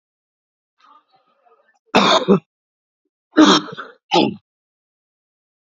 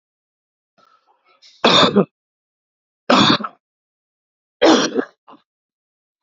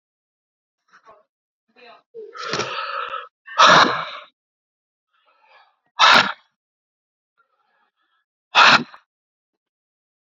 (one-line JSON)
{"cough_length": "5.6 s", "cough_amplitude": 32767, "cough_signal_mean_std_ratio": 0.31, "three_cough_length": "6.2 s", "three_cough_amplitude": 32768, "three_cough_signal_mean_std_ratio": 0.33, "exhalation_length": "10.3 s", "exhalation_amplitude": 32339, "exhalation_signal_mean_std_ratio": 0.28, "survey_phase": "beta (2021-08-13 to 2022-03-07)", "age": "45-64", "gender": "Male", "wearing_mask": "No", "symptom_cough_any": true, "symptom_runny_or_blocked_nose": true, "symptom_fatigue": true, "symptom_headache": true, "symptom_onset": "3 days", "smoker_status": "Never smoked", "respiratory_condition_asthma": true, "respiratory_condition_other": false, "recruitment_source": "Test and Trace", "submission_delay": "2 days", "covid_test_result": "Positive", "covid_test_method": "RT-qPCR", "covid_ct_value": 17.8, "covid_ct_gene": "ORF1ab gene", "covid_ct_mean": 18.3, "covid_viral_load": "960000 copies/ml", "covid_viral_load_category": "Low viral load (10K-1M copies/ml)"}